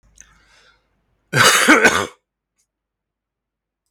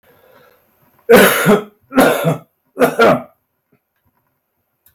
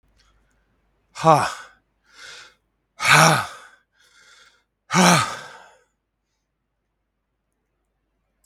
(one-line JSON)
{"cough_length": "3.9 s", "cough_amplitude": 32767, "cough_signal_mean_std_ratio": 0.33, "three_cough_length": "4.9 s", "three_cough_amplitude": 32768, "three_cough_signal_mean_std_ratio": 0.42, "exhalation_length": "8.5 s", "exhalation_amplitude": 32768, "exhalation_signal_mean_std_ratio": 0.29, "survey_phase": "beta (2021-08-13 to 2022-03-07)", "age": "65+", "gender": "Male", "wearing_mask": "No", "symptom_runny_or_blocked_nose": true, "smoker_status": "Never smoked", "respiratory_condition_asthma": true, "respiratory_condition_other": false, "recruitment_source": "REACT", "submission_delay": "1 day", "covid_test_result": "Negative", "covid_test_method": "RT-qPCR", "influenza_a_test_result": "Unknown/Void", "influenza_b_test_result": "Unknown/Void"}